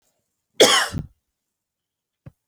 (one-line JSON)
{"cough_length": "2.5 s", "cough_amplitude": 30665, "cough_signal_mean_std_ratio": 0.27, "survey_phase": "beta (2021-08-13 to 2022-03-07)", "age": "18-44", "gender": "Female", "wearing_mask": "No", "symptom_none": true, "smoker_status": "Never smoked", "respiratory_condition_asthma": false, "respiratory_condition_other": false, "recruitment_source": "REACT", "submission_delay": "1 day", "covid_test_result": "Negative", "covid_test_method": "RT-qPCR"}